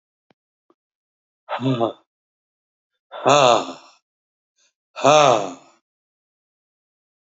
exhalation_length: 7.3 s
exhalation_amplitude: 29845
exhalation_signal_mean_std_ratio: 0.3
survey_phase: alpha (2021-03-01 to 2021-08-12)
age: 65+
gender: Male
wearing_mask: 'No'
symptom_none: true
smoker_status: Never smoked
respiratory_condition_asthma: false
respiratory_condition_other: false
recruitment_source: REACT
submission_delay: 2 days
covid_test_result: Negative
covid_test_method: RT-qPCR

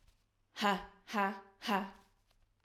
exhalation_length: 2.6 s
exhalation_amplitude: 4351
exhalation_signal_mean_std_ratio: 0.41
survey_phase: alpha (2021-03-01 to 2021-08-12)
age: 18-44
gender: Female
wearing_mask: 'No'
symptom_none: true
smoker_status: Current smoker (11 or more cigarettes per day)
respiratory_condition_asthma: false
respiratory_condition_other: false
recruitment_source: REACT
submission_delay: 1 day
covid_test_result: Negative
covid_test_method: RT-qPCR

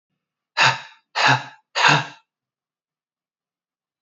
exhalation_length: 4.0 s
exhalation_amplitude: 26235
exhalation_signal_mean_std_ratio: 0.34
survey_phase: beta (2021-08-13 to 2022-03-07)
age: 18-44
gender: Male
wearing_mask: 'No'
symptom_cough_any: true
symptom_runny_or_blocked_nose: true
symptom_sore_throat: true
symptom_change_to_sense_of_smell_or_taste: true
symptom_loss_of_taste: true
symptom_onset: 5 days
smoker_status: Never smoked
respiratory_condition_asthma: true
respiratory_condition_other: false
recruitment_source: Test and Trace
submission_delay: 2 days
covid_test_result: Positive
covid_test_method: RT-qPCR
covid_ct_value: 13.0
covid_ct_gene: ORF1ab gene
covid_ct_mean: 13.4
covid_viral_load: 41000000 copies/ml
covid_viral_load_category: High viral load (>1M copies/ml)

